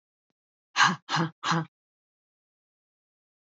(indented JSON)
{
  "exhalation_length": "3.6 s",
  "exhalation_amplitude": 13023,
  "exhalation_signal_mean_std_ratio": 0.3,
  "survey_phase": "alpha (2021-03-01 to 2021-08-12)",
  "age": "45-64",
  "gender": "Female",
  "wearing_mask": "No",
  "symptom_none": true,
  "smoker_status": "Never smoked",
  "respiratory_condition_asthma": false,
  "respiratory_condition_other": false,
  "recruitment_source": "REACT",
  "submission_delay": "2 days",
  "covid_test_result": "Negative",
  "covid_test_method": "RT-qPCR"
}